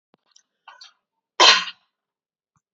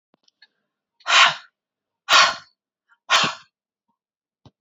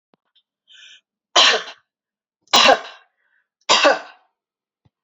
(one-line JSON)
{"cough_length": "2.7 s", "cough_amplitude": 31713, "cough_signal_mean_std_ratio": 0.23, "exhalation_length": "4.6 s", "exhalation_amplitude": 28793, "exhalation_signal_mean_std_ratio": 0.3, "three_cough_length": "5.0 s", "three_cough_amplitude": 32309, "three_cough_signal_mean_std_ratio": 0.32, "survey_phase": "beta (2021-08-13 to 2022-03-07)", "age": "45-64", "gender": "Female", "wearing_mask": "No", "symptom_none": true, "smoker_status": "Never smoked", "respiratory_condition_asthma": false, "respiratory_condition_other": false, "recruitment_source": "REACT", "submission_delay": "2 days", "covid_test_result": "Negative", "covid_test_method": "RT-qPCR", "influenza_a_test_result": "Negative", "influenza_b_test_result": "Negative"}